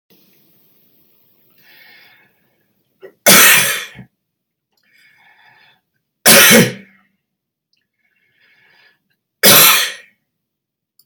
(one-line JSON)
{"three_cough_length": "11.1 s", "three_cough_amplitude": 32768, "three_cough_signal_mean_std_ratio": 0.3, "survey_phase": "beta (2021-08-13 to 2022-03-07)", "age": "65+", "gender": "Male", "wearing_mask": "No", "symptom_cough_any": true, "symptom_new_continuous_cough": true, "symptom_runny_or_blocked_nose": true, "symptom_shortness_of_breath": true, "symptom_sore_throat": true, "symptom_diarrhoea": true, "symptom_fatigue": true, "symptom_fever_high_temperature": true, "symptom_other": true, "symptom_onset": "3 days", "smoker_status": "Never smoked", "respiratory_condition_asthma": true, "respiratory_condition_other": false, "recruitment_source": "Test and Trace", "submission_delay": "1 day", "covid_test_result": "Positive", "covid_test_method": "RT-qPCR"}